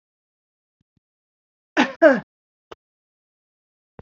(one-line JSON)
{"cough_length": "4.0 s", "cough_amplitude": 27131, "cough_signal_mean_std_ratio": 0.2, "survey_phase": "beta (2021-08-13 to 2022-03-07)", "age": "45-64", "gender": "Female", "wearing_mask": "No", "symptom_cough_any": true, "symptom_onset": "5 days", "smoker_status": "Never smoked", "respiratory_condition_asthma": false, "respiratory_condition_other": false, "recruitment_source": "REACT", "submission_delay": "1 day", "covid_test_result": "Negative", "covid_test_method": "RT-qPCR"}